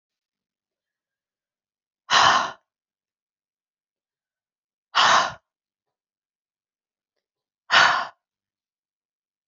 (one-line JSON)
{"exhalation_length": "9.5 s", "exhalation_amplitude": 24896, "exhalation_signal_mean_std_ratio": 0.26, "survey_phase": "beta (2021-08-13 to 2022-03-07)", "age": "45-64", "gender": "Female", "wearing_mask": "No", "symptom_cough_any": true, "symptom_new_continuous_cough": true, "symptom_runny_or_blocked_nose": true, "symptom_sore_throat": true, "symptom_fatigue": true, "symptom_fever_high_temperature": true, "symptom_headache": true, "symptom_onset": "3 days", "smoker_status": "Never smoked", "respiratory_condition_asthma": false, "respiratory_condition_other": false, "recruitment_source": "Test and Trace", "submission_delay": "2 days", "covid_test_result": "Positive", "covid_test_method": "RT-qPCR", "covid_ct_value": 32.1, "covid_ct_gene": "ORF1ab gene"}